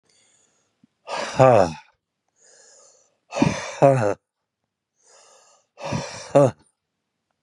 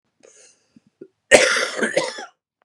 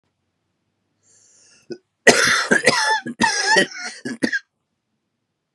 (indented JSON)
{
  "exhalation_length": "7.4 s",
  "exhalation_amplitude": 30570,
  "exhalation_signal_mean_std_ratio": 0.31,
  "cough_length": "2.6 s",
  "cough_amplitude": 32768,
  "cough_signal_mean_std_ratio": 0.37,
  "three_cough_length": "5.5 s",
  "three_cough_amplitude": 32768,
  "three_cough_signal_mean_std_ratio": 0.42,
  "survey_phase": "beta (2021-08-13 to 2022-03-07)",
  "age": "45-64",
  "gender": "Male",
  "wearing_mask": "No",
  "symptom_cough_any": true,
  "symptom_runny_or_blocked_nose": true,
  "symptom_other": true,
  "symptom_onset": "3 days",
  "smoker_status": "Never smoked",
  "respiratory_condition_asthma": false,
  "respiratory_condition_other": false,
  "recruitment_source": "Test and Trace",
  "submission_delay": "2 days",
  "covid_test_result": "Positive",
  "covid_test_method": "RT-qPCR",
  "covid_ct_value": 15.1,
  "covid_ct_gene": "N gene"
}